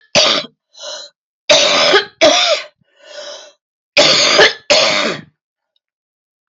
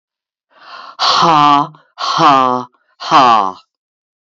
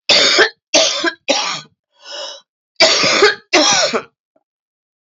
three_cough_length: 6.5 s
three_cough_amplitude: 32767
three_cough_signal_mean_std_ratio: 0.53
exhalation_length: 4.4 s
exhalation_amplitude: 29568
exhalation_signal_mean_std_ratio: 0.53
cough_length: 5.1 s
cough_amplitude: 32767
cough_signal_mean_std_ratio: 0.55
survey_phase: beta (2021-08-13 to 2022-03-07)
age: 65+
gender: Female
wearing_mask: 'No'
symptom_cough_any: true
symptom_runny_or_blocked_nose: true
symptom_sore_throat: true
symptom_diarrhoea: true
symptom_fatigue: true
symptom_fever_high_temperature: true
symptom_headache: true
smoker_status: Never smoked
respiratory_condition_asthma: false
respiratory_condition_other: false
recruitment_source: Test and Trace
submission_delay: 2 days
covid_test_result: Positive
covid_test_method: RT-qPCR
covid_ct_value: 18.3
covid_ct_gene: S gene
covid_ct_mean: 19.2
covid_viral_load: 510000 copies/ml
covid_viral_load_category: Low viral load (10K-1M copies/ml)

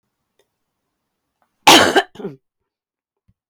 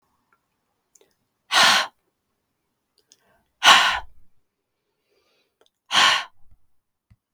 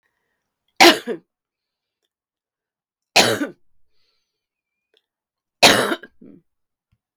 cough_length: 3.5 s
cough_amplitude: 32768
cough_signal_mean_std_ratio: 0.25
exhalation_length: 7.3 s
exhalation_amplitude: 32768
exhalation_signal_mean_std_ratio: 0.29
three_cough_length: 7.2 s
three_cough_amplitude: 32768
three_cough_signal_mean_std_ratio: 0.24
survey_phase: beta (2021-08-13 to 2022-03-07)
age: 65+
gender: Female
wearing_mask: 'No'
symptom_cough_any: true
symptom_runny_or_blocked_nose: true
symptom_onset: 3 days
smoker_status: Never smoked
respiratory_condition_asthma: false
respiratory_condition_other: false
recruitment_source: Test and Trace
submission_delay: 2 days
covid_test_result: Positive
covid_test_method: ePCR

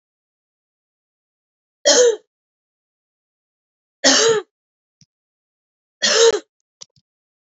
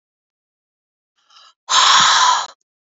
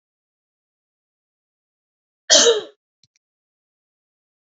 three_cough_length: 7.4 s
three_cough_amplitude: 32767
three_cough_signal_mean_std_ratio: 0.3
exhalation_length: 3.0 s
exhalation_amplitude: 31136
exhalation_signal_mean_std_ratio: 0.43
cough_length: 4.5 s
cough_amplitude: 28531
cough_signal_mean_std_ratio: 0.2
survey_phase: beta (2021-08-13 to 2022-03-07)
age: 45-64
gender: Female
wearing_mask: 'No'
symptom_none: true
smoker_status: Never smoked
respiratory_condition_asthma: false
respiratory_condition_other: false
recruitment_source: Test and Trace
submission_delay: 2 days
covid_test_result: Positive
covid_test_method: RT-qPCR
covid_ct_value: 24.0
covid_ct_gene: N gene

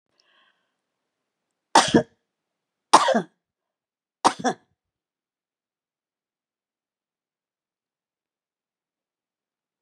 three_cough_length: 9.8 s
three_cough_amplitude: 32263
three_cough_signal_mean_std_ratio: 0.18
survey_phase: beta (2021-08-13 to 2022-03-07)
age: 65+
gender: Female
wearing_mask: 'No'
symptom_none: true
symptom_onset: 6 days
smoker_status: Ex-smoker
respiratory_condition_asthma: false
respiratory_condition_other: false
recruitment_source: REACT
submission_delay: 1 day
covid_test_result: Negative
covid_test_method: RT-qPCR
influenza_a_test_result: Negative
influenza_b_test_result: Negative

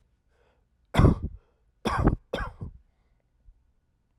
cough_length: 4.2 s
cough_amplitude: 14324
cough_signal_mean_std_ratio: 0.31
survey_phase: alpha (2021-03-01 to 2021-08-12)
age: 18-44
gender: Male
wearing_mask: 'No'
symptom_none: true
smoker_status: Ex-smoker
respiratory_condition_asthma: false
respiratory_condition_other: false
recruitment_source: REACT
submission_delay: 1 day
covid_test_result: Negative
covid_test_method: RT-qPCR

